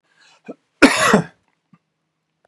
{
  "cough_length": "2.5 s",
  "cough_amplitude": 32768,
  "cough_signal_mean_std_ratio": 0.3,
  "survey_phase": "beta (2021-08-13 to 2022-03-07)",
  "age": "45-64",
  "gender": "Male",
  "wearing_mask": "No",
  "symptom_none": true,
  "smoker_status": "Never smoked",
  "respiratory_condition_asthma": false,
  "respiratory_condition_other": false,
  "recruitment_source": "REACT",
  "submission_delay": "2 days",
  "covid_test_result": "Negative",
  "covid_test_method": "RT-qPCR",
  "influenza_a_test_result": "Negative",
  "influenza_b_test_result": "Negative"
}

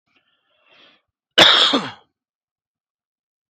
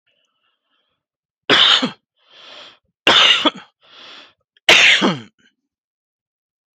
{
  "cough_length": "3.5 s",
  "cough_amplitude": 31625,
  "cough_signal_mean_std_ratio": 0.28,
  "three_cough_length": "6.7 s",
  "three_cough_amplitude": 32768,
  "three_cough_signal_mean_std_ratio": 0.36,
  "survey_phase": "beta (2021-08-13 to 2022-03-07)",
  "age": "45-64",
  "gender": "Male",
  "wearing_mask": "No",
  "symptom_none": true,
  "smoker_status": "Never smoked",
  "respiratory_condition_asthma": false,
  "respiratory_condition_other": false,
  "recruitment_source": "REACT",
  "submission_delay": "2 days",
  "covid_test_result": "Negative",
  "covid_test_method": "RT-qPCR"
}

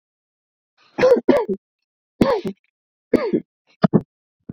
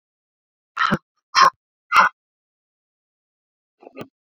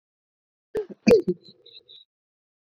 {
  "three_cough_length": "4.5 s",
  "three_cough_amplitude": 28653,
  "three_cough_signal_mean_std_ratio": 0.36,
  "exhalation_length": "4.3 s",
  "exhalation_amplitude": 27373,
  "exhalation_signal_mean_std_ratio": 0.26,
  "cough_length": "2.6 s",
  "cough_amplitude": 22838,
  "cough_signal_mean_std_ratio": 0.26,
  "survey_phase": "beta (2021-08-13 to 2022-03-07)",
  "age": "18-44",
  "gender": "Female",
  "wearing_mask": "No",
  "symptom_none": true,
  "smoker_status": "Ex-smoker",
  "respiratory_condition_asthma": false,
  "respiratory_condition_other": false,
  "recruitment_source": "REACT",
  "submission_delay": "1 day",
  "covid_test_result": "Negative",
  "covid_test_method": "RT-qPCR",
  "covid_ct_value": 45.0,
  "covid_ct_gene": "N gene"
}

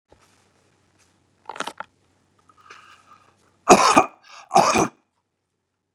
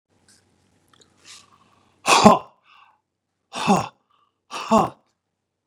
{
  "cough_length": "5.9 s",
  "cough_amplitude": 32767,
  "cough_signal_mean_std_ratio": 0.26,
  "exhalation_length": "5.7 s",
  "exhalation_amplitude": 32768,
  "exhalation_signal_mean_std_ratio": 0.27,
  "survey_phase": "beta (2021-08-13 to 2022-03-07)",
  "age": "65+",
  "gender": "Male",
  "wearing_mask": "No",
  "symptom_none": true,
  "smoker_status": "Never smoked",
  "respiratory_condition_asthma": false,
  "respiratory_condition_other": false,
  "recruitment_source": "REACT",
  "submission_delay": "0 days",
  "covid_test_result": "Negative",
  "covid_test_method": "RT-qPCR",
  "influenza_a_test_result": "Negative",
  "influenza_b_test_result": "Negative"
}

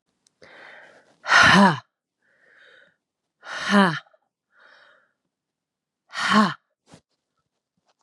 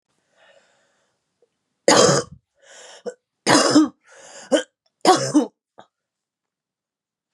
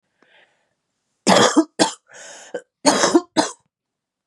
{
  "exhalation_length": "8.0 s",
  "exhalation_amplitude": 27793,
  "exhalation_signal_mean_std_ratio": 0.29,
  "three_cough_length": "7.3 s",
  "three_cough_amplitude": 32321,
  "three_cough_signal_mean_std_ratio": 0.33,
  "cough_length": "4.3 s",
  "cough_amplitude": 32767,
  "cough_signal_mean_std_ratio": 0.37,
  "survey_phase": "beta (2021-08-13 to 2022-03-07)",
  "age": "45-64",
  "gender": "Female",
  "wearing_mask": "No",
  "symptom_cough_any": true,
  "symptom_runny_or_blocked_nose": true,
  "symptom_sore_throat": true,
  "symptom_abdominal_pain": true,
  "symptom_diarrhoea": true,
  "symptom_fatigue": true,
  "symptom_fever_high_temperature": true,
  "symptom_headache": true,
  "symptom_onset": "4 days",
  "smoker_status": "Never smoked",
  "respiratory_condition_asthma": false,
  "respiratory_condition_other": false,
  "recruitment_source": "Test and Trace",
  "submission_delay": "4 days",
  "covid_test_result": "Positive",
  "covid_test_method": "RT-qPCR",
  "covid_ct_value": 17.1,
  "covid_ct_gene": "N gene"
}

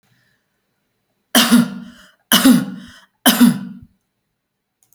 {
  "three_cough_length": "4.9 s",
  "three_cough_amplitude": 32768,
  "three_cough_signal_mean_std_ratio": 0.37,
  "survey_phase": "alpha (2021-03-01 to 2021-08-12)",
  "age": "45-64",
  "gender": "Female",
  "wearing_mask": "No",
  "symptom_none": true,
  "smoker_status": "Never smoked",
  "respiratory_condition_asthma": false,
  "respiratory_condition_other": false,
  "recruitment_source": "REACT",
  "submission_delay": "1 day",
  "covid_test_result": "Negative",
  "covid_test_method": "RT-qPCR"
}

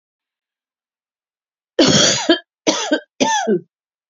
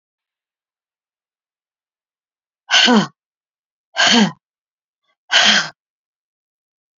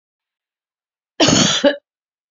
{
  "three_cough_length": "4.1 s",
  "three_cough_amplitude": 29661,
  "three_cough_signal_mean_std_ratio": 0.44,
  "exhalation_length": "7.0 s",
  "exhalation_amplitude": 32443,
  "exhalation_signal_mean_std_ratio": 0.31,
  "cough_length": "2.3 s",
  "cough_amplitude": 29129,
  "cough_signal_mean_std_ratio": 0.38,
  "survey_phase": "beta (2021-08-13 to 2022-03-07)",
  "age": "65+",
  "gender": "Female",
  "wearing_mask": "No",
  "symptom_cough_any": true,
  "symptom_new_continuous_cough": true,
  "symptom_runny_or_blocked_nose": true,
  "symptom_fatigue": true,
  "symptom_change_to_sense_of_smell_or_taste": true,
  "symptom_loss_of_taste": true,
  "symptom_other": true,
  "symptom_onset": "7 days",
  "smoker_status": "Ex-smoker",
  "respiratory_condition_asthma": false,
  "respiratory_condition_other": false,
  "recruitment_source": "Test and Trace",
  "submission_delay": "1 day",
  "covid_test_result": "Positive",
  "covid_test_method": "RT-qPCR",
  "covid_ct_value": 27.8,
  "covid_ct_gene": "N gene",
  "covid_ct_mean": 28.9,
  "covid_viral_load": "330 copies/ml",
  "covid_viral_load_category": "Minimal viral load (< 10K copies/ml)"
}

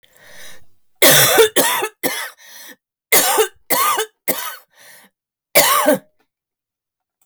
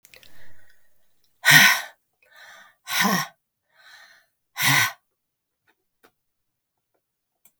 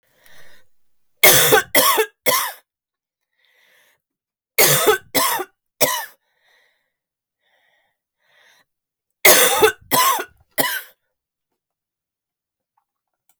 {
  "cough_length": "7.3 s",
  "cough_amplitude": 32768,
  "cough_signal_mean_std_ratio": 0.47,
  "exhalation_length": "7.6 s",
  "exhalation_amplitude": 32768,
  "exhalation_signal_mean_std_ratio": 0.3,
  "three_cough_length": "13.4 s",
  "three_cough_amplitude": 32768,
  "three_cough_signal_mean_std_ratio": 0.36,
  "survey_phase": "beta (2021-08-13 to 2022-03-07)",
  "age": "45-64",
  "gender": "Female",
  "wearing_mask": "No",
  "symptom_cough_any": true,
  "symptom_runny_or_blocked_nose": true,
  "symptom_shortness_of_breath": true,
  "symptom_sore_throat": true,
  "symptom_fatigue": true,
  "symptom_headache": true,
  "symptom_onset": "6 days",
  "smoker_status": "Never smoked",
  "respiratory_condition_asthma": false,
  "respiratory_condition_other": false,
  "recruitment_source": "Test and Trace",
  "submission_delay": "2 days",
  "covid_test_result": "Positive",
  "covid_test_method": "RT-qPCR",
  "covid_ct_value": 24.8,
  "covid_ct_gene": "ORF1ab gene"
}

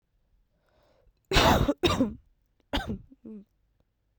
{
  "cough_length": "4.2 s",
  "cough_amplitude": 14870,
  "cough_signal_mean_std_ratio": 0.36,
  "survey_phase": "beta (2021-08-13 to 2022-03-07)",
  "age": "18-44",
  "gender": "Female",
  "wearing_mask": "No",
  "symptom_cough_any": true,
  "symptom_runny_or_blocked_nose": true,
  "symptom_sore_throat": true,
  "symptom_fatigue": true,
  "symptom_headache": true,
  "symptom_other": true,
  "smoker_status": "Never smoked",
  "respiratory_condition_asthma": false,
  "respiratory_condition_other": false,
  "recruitment_source": "Test and Trace",
  "submission_delay": "2 days",
  "covid_test_result": "Positive",
  "covid_test_method": "ePCR"
}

